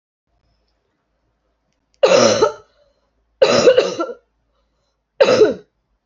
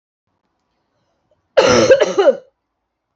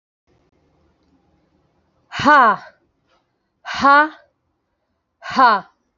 {"three_cough_length": "6.1 s", "three_cough_amplitude": 32755, "three_cough_signal_mean_std_ratio": 0.38, "cough_length": "3.2 s", "cough_amplitude": 27751, "cough_signal_mean_std_ratio": 0.39, "exhalation_length": "6.0 s", "exhalation_amplitude": 29098, "exhalation_signal_mean_std_ratio": 0.32, "survey_phase": "alpha (2021-03-01 to 2021-08-12)", "age": "18-44", "gender": "Female", "wearing_mask": "No", "symptom_cough_any": true, "symptom_fatigue": true, "symptom_headache": true, "smoker_status": "Ex-smoker", "respiratory_condition_asthma": false, "respiratory_condition_other": false, "recruitment_source": "Test and Trace", "submission_delay": "1 day", "covid_test_result": "Positive", "covid_test_method": "RT-qPCR"}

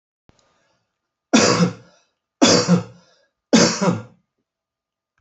{"three_cough_length": "5.2 s", "three_cough_amplitude": 29915, "three_cough_signal_mean_std_ratio": 0.38, "survey_phase": "alpha (2021-03-01 to 2021-08-12)", "age": "65+", "gender": "Male", "wearing_mask": "No", "symptom_none": true, "smoker_status": "Never smoked", "respiratory_condition_asthma": false, "respiratory_condition_other": false, "recruitment_source": "REACT", "submission_delay": "2 days", "covid_test_result": "Negative", "covid_test_method": "RT-qPCR"}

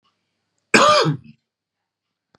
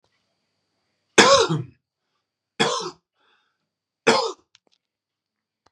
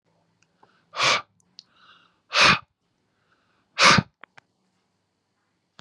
{"cough_length": "2.4 s", "cough_amplitude": 32767, "cough_signal_mean_std_ratio": 0.34, "three_cough_length": "5.7 s", "three_cough_amplitude": 32767, "three_cough_signal_mean_std_ratio": 0.29, "exhalation_length": "5.8 s", "exhalation_amplitude": 26470, "exhalation_signal_mean_std_ratio": 0.27, "survey_phase": "beta (2021-08-13 to 2022-03-07)", "age": "18-44", "gender": "Male", "wearing_mask": "No", "symptom_new_continuous_cough": true, "symptom_onset": "5 days", "smoker_status": "Never smoked", "respiratory_condition_asthma": false, "respiratory_condition_other": false, "recruitment_source": "Test and Trace", "submission_delay": "1 day", "covid_test_result": "Negative", "covid_test_method": "ePCR"}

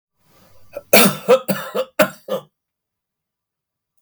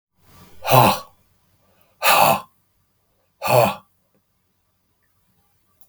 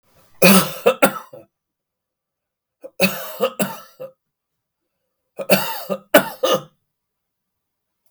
{"cough_length": "4.0 s", "cough_amplitude": 32768, "cough_signal_mean_std_ratio": 0.33, "exhalation_length": "5.9 s", "exhalation_amplitude": 32766, "exhalation_signal_mean_std_ratio": 0.33, "three_cough_length": "8.1 s", "three_cough_amplitude": 32768, "three_cough_signal_mean_std_ratio": 0.32, "survey_phase": "beta (2021-08-13 to 2022-03-07)", "age": "65+", "gender": "Male", "wearing_mask": "No", "symptom_none": true, "smoker_status": "Never smoked", "respiratory_condition_asthma": false, "respiratory_condition_other": false, "recruitment_source": "REACT", "submission_delay": "2 days", "covid_test_result": "Negative", "covid_test_method": "RT-qPCR", "influenza_a_test_result": "Negative", "influenza_b_test_result": "Negative"}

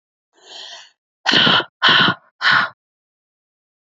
{"exhalation_length": "3.8 s", "exhalation_amplitude": 29494, "exhalation_signal_mean_std_ratio": 0.42, "survey_phase": "beta (2021-08-13 to 2022-03-07)", "age": "18-44", "gender": "Female", "wearing_mask": "No", "symptom_runny_or_blocked_nose": true, "symptom_fatigue": true, "symptom_change_to_sense_of_smell_or_taste": true, "symptom_onset": "6 days", "smoker_status": "Never smoked", "respiratory_condition_asthma": false, "respiratory_condition_other": false, "recruitment_source": "Test and Trace", "submission_delay": "2 days", "covid_test_result": "Positive", "covid_test_method": "RT-qPCR", "covid_ct_value": 23.6, "covid_ct_gene": "N gene"}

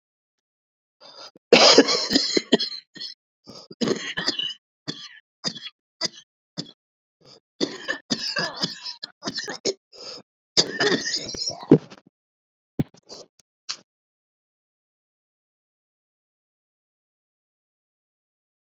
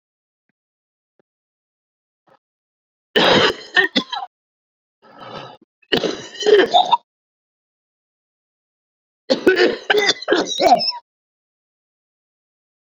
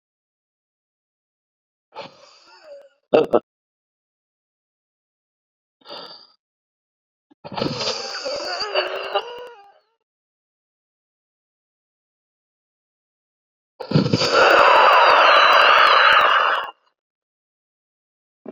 {"cough_length": "18.7 s", "cough_amplitude": 32041, "cough_signal_mean_std_ratio": 0.29, "three_cough_length": "13.0 s", "three_cough_amplitude": 28111, "three_cough_signal_mean_std_ratio": 0.35, "exhalation_length": "18.5 s", "exhalation_amplitude": 32768, "exhalation_signal_mean_std_ratio": 0.37, "survey_phase": "beta (2021-08-13 to 2022-03-07)", "age": "45-64", "gender": "Male", "wearing_mask": "No", "symptom_cough_any": true, "symptom_runny_or_blocked_nose": true, "symptom_sore_throat": true, "symptom_abdominal_pain": true, "symptom_diarrhoea": true, "symptom_fatigue": true, "symptom_fever_high_temperature": true, "symptom_headache": true, "symptom_other": true, "symptom_onset": "3 days", "smoker_status": "Current smoker (e-cigarettes or vapes only)", "respiratory_condition_asthma": false, "respiratory_condition_other": false, "recruitment_source": "Test and Trace", "submission_delay": "2 days", "covid_test_result": "Positive", "covid_test_method": "RT-qPCR", "covid_ct_value": 15.0, "covid_ct_gene": "ORF1ab gene", "covid_ct_mean": 15.3, "covid_viral_load": "9800000 copies/ml", "covid_viral_load_category": "High viral load (>1M copies/ml)"}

